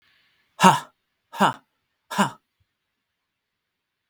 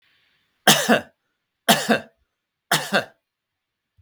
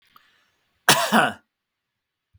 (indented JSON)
{
  "exhalation_length": "4.1 s",
  "exhalation_amplitude": 32768,
  "exhalation_signal_mean_std_ratio": 0.24,
  "three_cough_length": "4.0 s",
  "three_cough_amplitude": 32768,
  "three_cough_signal_mean_std_ratio": 0.33,
  "cough_length": "2.4 s",
  "cough_amplitude": 32768,
  "cough_signal_mean_std_ratio": 0.31,
  "survey_phase": "beta (2021-08-13 to 2022-03-07)",
  "age": "45-64",
  "wearing_mask": "No",
  "symptom_none": true,
  "smoker_status": "Never smoked",
  "respiratory_condition_asthma": true,
  "respiratory_condition_other": false,
  "recruitment_source": "Test and Trace",
  "submission_delay": "2 days",
  "covid_test_result": "Positive",
  "covid_test_method": "RT-qPCR",
  "covid_ct_value": 33.7,
  "covid_ct_gene": "ORF1ab gene"
}